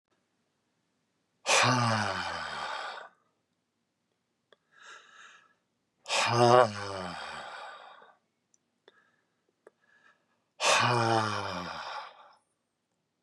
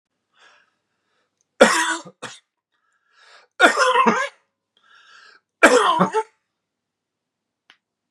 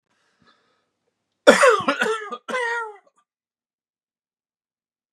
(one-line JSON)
{"exhalation_length": "13.2 s", "exhalation_amplitude": 14988, "exhalation_signal_mean_std_ratio": 0.38, "three_cough_length": "8.1 s", "three_cough_amplitude": 32768, "three_cough_signal_mean_std_ratio": 0.33, "cough_length": "5.1 s", "cough_amplitude": 32767, "cough_signal_mean_std_ratio": 0.31, "survey_phase": "beta (2021-08-13 to 2022-03-07)", "age": "65+", "gender": "Male", "wearing_mask": "No", "symptom_cough_any": true, "smoker_status": "Ex-smoker", "respiratory_condition_asthma": false, "respiratory_condition_other": false, "recruitment_source": "REACT", "submission_delay": "1 day", "covid_test_result": "Negative", "covid_test_method": "RT-qPCR", "influenza_a_test_result": "Negative", "influenza_b_test_result": "Negative"}